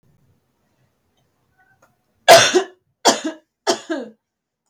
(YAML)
three_cough_length: 4.7 s
three_cough_amplitude: 32768
three_cough_signal_mean_std_ratio: 0.28
survey_phase: beta (2021-08-13 to 2022-03-07)
age: 18-44
gender: Female
wearing_mask: 'No'
symptom_cough_any: true
symptom_runny_or_blocked_nose: true
symptom_change_to_sense_of_smell_or_taste: true
symptom_onset: 8 days
smoker_status: Never smoked
respiratory_condition_asthma: false
respiratory_condition_other: false
recruitment_source: REACT
submission_delay: 2 days
covid_test_result: Negative
covid_test_method: RT-qPCR
influenza_a_test_result: Negative
influenza_b_test_result: Negative